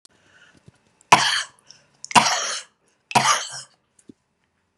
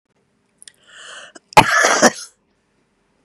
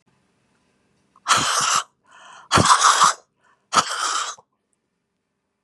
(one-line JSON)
{"three_cough_length": "4.8 s", "three_cough_amplitude": 32768, "three_cough_signal_mean_std_ratio": 0.33, "cough_length": "3.2 s", "cough_amplitude": 32768, "cough_signal_mean_std_ratio": 0.31, "exhalation_length": "5.6 s", "exhalation_amplitude": 31735, "exhalation_signal_mean_std_ratio": 0.42, "survey_phase": "beta (2021-08-13 to 2022-03-07)", "age": "65+", "gender": "Female", "wearing_mask": "No", "symptom_cough_any": true, "symptom_runny_or_blocked_nose": true, "symptom_shortness_of_breath": true, "symptom_sore_throat": true, "symptom_fatigue": true, "symptom_headache": true, "symptom_onset": "5 days", "smoker_status": "Ex-smoker", "respiratory_condition_asthma": false, "respiratory_condition_other": true, "recruitment_source": "Test and Trace", "submission_delay": "2 days", "covid_test_result": "Positive", "covid_test_method": "RT-qPCR", "covid_ct_value": 20.2, "covid_ct_gene": "ORF1ab gene", "covid_ct_mean": 20.7, "covid_viral_load": "170000 copies/ml", "covid_viral_load_category": "Low viral load (10K-1M copies/ml)"}